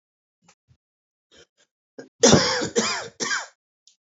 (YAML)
cough_length: 4.2 s
cough_amplitude: 26836
cough_signal_mean_std_ratio: 0.33
survey_phase: beta (2021-08-13 to 2022-03-07)
age: 18-44
gender: Female
wearing_mask: 'No'
symptom_cough_any: true
symptom_new_continuous_cough: true
symptom_runny_or_blocked_nose: true
symptom_sore_throat: true
symptom_abdominal_pain: true
symptom_fatigue: true
symptom_headache: true
symptom_change_to_sense_of_smell_or_taste: true
symptom_other: true
smoker_status: Current smoker (11 or more cigarettes per day)
respiratory_condition_asthma: false
respiratory_condition_other: false
recruitment_source: Test and Trace
submission_delay: 2 days
covid_test_result: Positive
covid_test_method: RT-qPCR
covid_ct_value: 18.9
covid_ct_gene: N gene
covid_ct_mean: 19.2
covid_viral_load: 510000 copies/ml
covid_viral_load_category: Low viral load (10K-1M copies/ml)